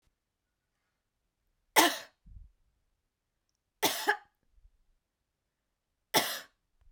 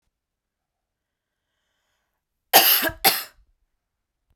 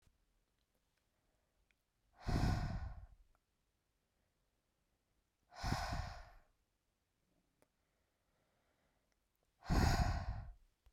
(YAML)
three_cough_length: 6.9 s
three_cough_amplitude: 14959
three_cough_signal_mean_std_ratio: 0.23
cough_length: 4.4 s
cough_amplitude: 32767
cough_signal_mean_std_ratio: 0.25
exhalation_length: 10.9 s
exhalation_amplitude: 3062
exhalation_signal_mean_std_ratio: 0.33
survey_phase: beta (2021-08-13 to 2022-03-07)
age: 18-44
gender: Female
wearing_mask: 'No'
symptom_none: true
smoker_status: Ex-smoker
respiratory_condition_asthma: false
respiratory_condition_other: false
recruitment_source: REACT
submission_delay: 5 days
covid_test_result: Negative
covid_test_method: RT-qPCR